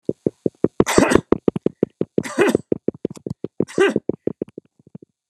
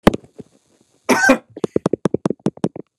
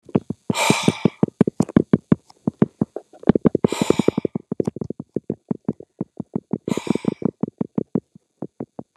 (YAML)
three_cough_length: 5.3 s
three_cough_amplitude: 29204
three_cough_signal_mean_std_ratio: 0.33
cough_length: 3.0 s
cough_amplitude: 29204
cough_signal_mean_std_ratio: 0.32
exhalation_length: 9.0 s
exhalation_amplitude: 29204
exhalation_signal_mean_std_ratio: 0.29
survey_phase: alpha (2021-03-01 to 2021-08-12)
age: 65+
gender: Male
wearing_mask: 'No'
symptom_none: true
smoker_status: Never smoked
respiratory_condition_asthma: true
respiratory_condition_other: false
recruitment_source: REACT
submission_delay: 1 day
covid_test_result: Negative
covid_test_method: RT-qPCR